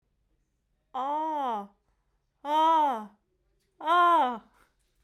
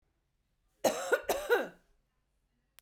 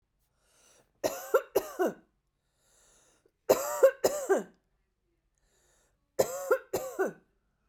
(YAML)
exhalation_length: 5.0 s
exhalation_amplitude: 5926
exhalation_signal_mean_std_ratio: 0.52
cough_length: 2.8 s
cough_amplitude: 6619
cough_signal_mean_std_ratio: 0.35
three_cough_length: 7.7 s
three_cough_amplitude: 12013
three_cough_signal_mean_std_ratio: 0.33
survey_phase: beta (2021-08-13 to 2022-03-07)
age: 45-64
gender: Female
wearing_mask: 'No'
symptom_none: true
smoker_status: Never smoked
respiratory_condition_asthma: false
respiratory_condition_other: false
recruitment_source: REACT
submission_delay: 3 days
covid_test_result: Negative
covid_test_method: RT-qPCR